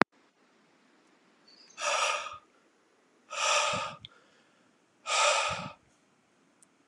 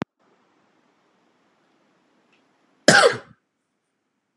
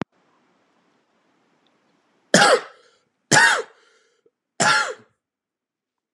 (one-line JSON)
{"exhalation_length": "6.9 s", "exhalation_amplitude": 32130, "exhalation_signal_mean_std_ratio": 0.4, "cough_length": "4.4 s", "cough_amplitude": 32768, "cough_signal_mean_std_ratio": 0.19, "three_cough_length": "6.1 s", "three_cough_amplitude": 32766, "three_cough_signal_mean_std_ratio": 0.3, "survey_phase": "beta (2021-08-13 to 2022-03-07)", "age": "18-44", "gender": "Male", "wearing_mask": "No", "symptom_cough_any": true, "symptom_runny_or_blocked_nose": true, "symptom_sore_throat": true, "symptom_fatigue": true, "symptom_fever_high_temperature": true, "symptom_headache": true, "symptom_change_to_sense_of_smell_or_taste": true, "symptom_loss_of_taste": true, "symptom_onset": "4 days", "smoker_status": "Never smoked", "respiratory_condition_asthma": false, "respiratory_condition_other": false, "recruitment_source": "Test and Trace", "submission_delay": "1 day", "covid_test_result": "Positive", "covid_test_method": "ePCR"}